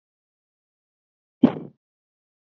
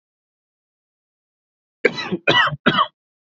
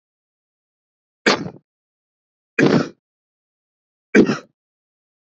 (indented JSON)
{
  "exhalation_length": "2.5 s",
  "exhalation_amplitude": 26748,
  "exhalation_signal_mean_std_ratio": 0.13,
  "cough_length": "3.3 s",
  "cough_amplitude": 29205,
  "cough_signal_mean_std_ratio": 0.34,
  "three_cough_length": "5.2 s",
  "three_cough_amplitude": 28692,
  "three_cough_signal_mean_std_ratio": 0.26,
  "survey_phase": "beta (2021-08-13 to 2022-03-07)",
  "age": "18-44",
  "gender": "Male",
  "wearing_mask": "No",
  "symptom_fatigue": true,
  "smoker_status": "Never smoked",
  "respiratory_condition_asthma": false,
  "respiratory_condition_other": false,
  "recruitment_source": "REACT",
  "submission_delay": "1 day",
  "covid_test_result": "Negative",
  "covid_test_method": "RT-qPCR"
}